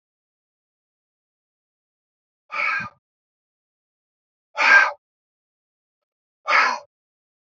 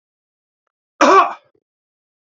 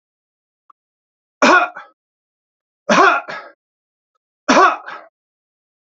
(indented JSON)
{
  "exhalation_length": "7.4 s",
  "exhalation_amplitude": 24450,
  "exhalation_signal_mean_std_ratio": 0.26,
  "cough_length": "2.4 s",
  "cough_amplitude": 27968,
  "cough_signal_mean_std_ratio": 0.28,
  "three_cough_length": "6.0 s",
  "three_cough_amplitude": 30975,
  "three_cough_signal_mean_std_ratio": 0.32,
  "survey_phase": "beta (2021-08-13 to 2022-03-07)",
  "age": "65+",
  "gender": "Male",
  "wearing_mask": "No",
  "symptom_none": true,
  "smoker_status": "Never smoked",
  "respiratory_condition_asthma": false,
  "respiratory_condition_other": false,
  "recruitment_source": "REACT",
  "submission_delay": "1 day",
  "covid_test_result": "Negative",
  "covid_test_method": "RT-qPCR",
  "influenza_a_test_result": "Negative",
  "influenza_b_test_result": "Negative"
}